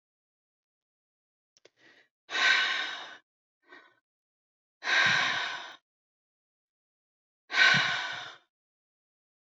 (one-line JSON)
{"exhalation_length": "9.6 s", "exhalation_amplitude": 13821, "exhalation_signal_mean_std_ratio": 0.36, "survey_phase": "beta (2021-08-13 to 2022-03-07)", "age": "65+", "gender": "Female", "wearing_mask": "No", "symptom_runny_or_blocked_nose": true, "smoker_status": "Ex-smoker", "respiratory_condition_asthma": false, "respiratory_condition_other": false, "recruitment_source": "Test and Trace", "submission_delay": "2 days", "covid_test_result": "Positive", "covid_test_method": "ePCR"}